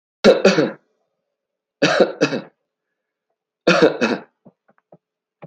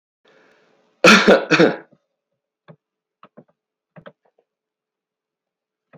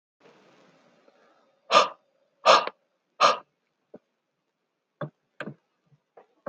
{"three_cough_length": "5.5 s", "three_cough_amplitude": 28402, "three_cough_signal_mean_std_ratio": 0.37, "cough_length": "6.0 s", "cough_amplitude": 29762, "cough_signal_mean_std_ratio": 0.25, "exhalation_length": "6.5 s", "exhalation_amplitude": 22505, "exhalation_signal_mean_std_ratio": 0.23, "survey_phase": "beta (2021-08-13 to 2022-03-07)", "age": "45-64", "gender": "Male", "wearing_mask": "No", "symptom_cough_any": true, "symptom_runny_or_blocked_nose": true, "symptom_other": true, "smoker_status": "Never smoked", "respiratory_condition_asthma": false, "respiratory_condition_other": false, "recruitment_source": "Test and Trace", "submission_delay": "2 days", "covid_test_result": "Positive", "covid_test_method": "RT-qPCR", "covid_ct_value": 30.2, "covid_ct_gene": "ORF1ab gene", "covid_ct_mean": 30.5, "covid_viral_load": "96 copies/ml", "covid_viral_load_category": "Minimal viral load (< 10K copies/ml)"}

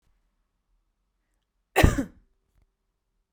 {"cough_length": "3.3 s", "cough_amplitude": 27275, "cough_signal_mean_std_ratio": 0.19, "survey_phase": "beta (2021-08-13 to 2022-03-07)", "age": "18-44", "gender": "Female", "wearing_mask": "No", "symptom_none": true, "smoker_status": "Never smoked", "respiratory_condition_asthma": false, "respiratory_condition_other": false, "recruitment_source": "REACT", "submission_delay": "0 days", "covid_test_result": "Negative", "covid_test_method": "RT-qPCR", "influenza_a_test_result": "Negative", "influenza_b_test_result": "Negative"}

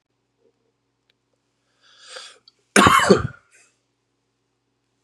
{"cough_length": "5.0 s", "cough_amplitude": 32606, "cough_signal_mean_std_ratio": 0.24, "survey_phase": "beta (2021-08-13 to 2022-03-07)", "age": "18-44", "gender": "Male", "wearing_mask": "No", "symptom_cough_any": true, "symptom_runny_or_blocked_nose": true, "symptom_fatigue": true, "symptom_headache": true, "symptom_change_to_sense_of_smell_or_taste": true, "symptom_onset": "3 days", "smoker_status": "Ex-smoker", "respiratory_condition_asthma": false, "respiratory_condition_other": false, "recruitment_source": "Test and Trace", "submission_delay": "2 days", "covid_test_result": "Positive", "covid_test_method": "RT-qPCR", "covid_ct_value": 23.4, "covid_ct_gene": "ORF1ab gene"}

